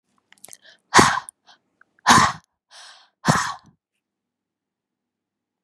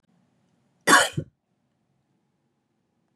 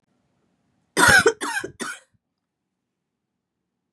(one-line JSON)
{"exhalation_length": "5.6 s", "exhalation_amplitude": 32768, "exhalation_signal_mean_std_ratio": 0.27, "cough_length": "3.2 s", "cough_amplitude": 26558, "cough_signal_mean_std_ratio": 0.21, "three_cough_length": "3.9 s", "three_cough_amplitude": 26821, "three_cough_signal_mean_std_ratio": 0.29, "survey_phase": "beta (2021-08-13 to 2022-03-07)", "age": "45-64", "gender": "Female", "wearing_mask": "No", "symptom_cough_any": true, "symptom_runny_or_blocked_nose": true, "symptom_shortness_of_breath": true, "symptom_sore_throat": true, "symptom_fatigue": true, "symptom_fever_high_temperature": true, "symptom_change_to_sense_of_smell_or_taste": true, "symptom_onset": "3 days", "smoker_status": "Ex-smoker", "respiratory_condition_asthma": true, "respiratory_condition_other": false, "recruitment_source": "Test and Trace", "submission_delay": "1 day", "covid_test_result": "Positive", "covid_test_method": "RT-qPCR", "covid_ct_value": 21.6, "covid_ct_gene": "N gene"}